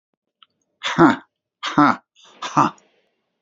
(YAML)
exhalation_length: 3.4 s
exhalation_amplitude: 29042
exhalation_signal_mean_std_ratio: 0.34
survey_phase: beta (2021-08-13 to 2022-03-07)
age: 65+
gender: Male
wearing_mask: 'No'
symptom_none: true
smoker_status: Current smoker (11 or more cigarettes per day)
respiratory_condition_asthma: false
respiratory_condition_other: false
recruitment_source: REACT
submission_delay: 1 day
covid_test_result: Negative
covid_test_method: RT-qPCR
influenza_a_test_result: Negative
influenza_b_test_result: Negative